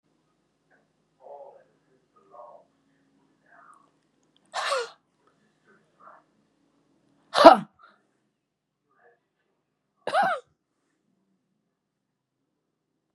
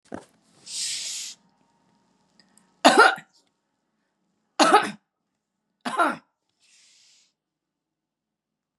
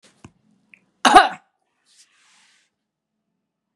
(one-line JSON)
{"exhalation_length": "13.1 s", "exhalation_amplitude": 32768, "exhalation_signal_mean_std_ratio": 0.15, "three_cough_length": "8.8 s", "three_cough_amplitude": 26910, "three_cough_signal_mean_std_ratio": 0.26, "cough_length": "3.8 s", "cough_amplitude": 32768, "cough_signal_mean_std_ratio": 0.19, "survey_phase": "beta (2021-08-13 to 2022-03-07)", "age": "45-64", "gender": "Female", "wearing_mask": "No", "symptom_none": true, "smoker_status": "Never smoked", "respiratory_condition_asthma": true, "respiratory_condition_other": false, "recruitment_source": "REACT", "submission_delay": "2 days", "covid_test_result": "Negative", "covid_test_method": "RT-qPCR", "influenza_a_test_result": "Negative", "influenza_b_test_result": "Negative"}